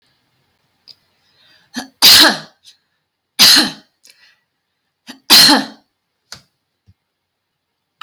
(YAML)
three_cough_length: 8.0 s
three_cough_amplitude: 32768
three_cough_signal_mean_std_ratio: 0.3
survey_phase: alpha (2021-03-01 to 2021-08-12)
age: 45-64
gender: Female
wearing_mask: 'No'
symptom_none: true
smoker_status: Prefer not to say
respiratory_condition_asthma: false
respiratory_condition_other: false
recruitment_source: REACT
submission_delay: 1 day
covid_test_result: Negative
covid_test_method: RT-qPCR